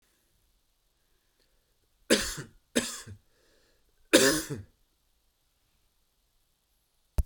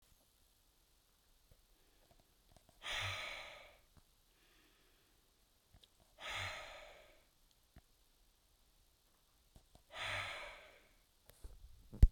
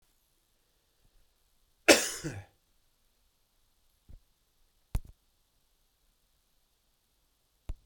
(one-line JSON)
{"three_cough_length": "7.3 s", "three_cough_amplitude": 16827, "three_cough_signal_mean_std_ratio": 0.24, "exhalation_length": "12.1 s", "exhalation_amplitude": 7763, "exhalation_signal_mean_std_ratio": 0.19, "cough_length": "7.9 s", "cough_amplitude": 19895, "cough_signal_mean_std_ratio": 0.16, "survey_phase": "beta (2021-08-13 to 2022-03-07)", "age": "45-64", "gender": "Male", "wearing_mask": "No", "symptom_none": true, "smoker_status": "Ex-smoker", "respiratory_condition_asthma": false, "respiratory_condition_other": false, "recruitment_source": "REACT", "submission_delay": "1 day", "covid_test_result": "Negative", "covid_test_method": "RT-qPCR", "influenza_a_test_result": "Negative", "influenza_b_test_result": "Negative"}